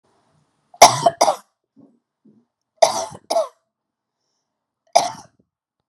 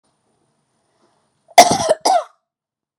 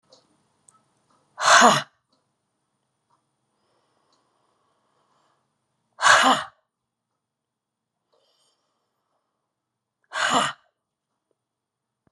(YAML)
three_cough_length: 5.9 s
three_cough_amplitude: 32768
three_cough_signal_mean_std_ratio: 0.25
cough_length: 3.0 s
cough_amplitude: 32768
cough_signal_mean_std_ratio: 0.29
exhalation_length: 12.1 s
exhalation_amplitude: 29848
exhalation_signal_mean_std_ratio: 0.23
survey_phase: beta (2021-08-13 to 2022-03-07)
age: 45-64
gender: Female
wearing_mask: 'No'
symptom_shortness_of_breath: true
symptom_sore_throat: true
symptom_onset: 4 days
smoker_status: Never smoked
respiratory_condition_asthma: false
respiratory_condition_other: false
recruitment_source: REACT
submission_delay: 2 days
covid_test_result: Negative
covid_test_method: RT-qPCR